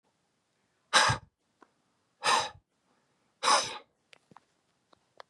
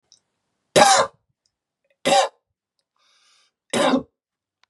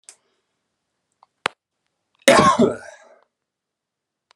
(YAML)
exhalation_length: 5.3 s
exhalation_amplitude: 12278
exhalation_signal_mean_std_ratio: 0.29
three_cough_length: 4.7 s
three_cough_amplitude: 32287
three_cough_signal_mean_std_ratio: 0.33
cough_length: 4.4 s
cough_amplitude: 32768
cough_signal_mean_std_ratio: 0.26
survey_phase: beta (2021-08-13 to 2022-03-07)
age: 18-44
gender: Male
wearing_mask: 'No'
symptom_none: true
smoker_status: Ex-smoker
respiratory_condition_asthma: false
respiratory_condition_other: false
recruitment_source: REACT
submission_delay: 1 day
covid_test_result: Negative
covid_test_method: RT-qPCR
influenza_a_test_result: Negative
influenza_b_test_result: Negative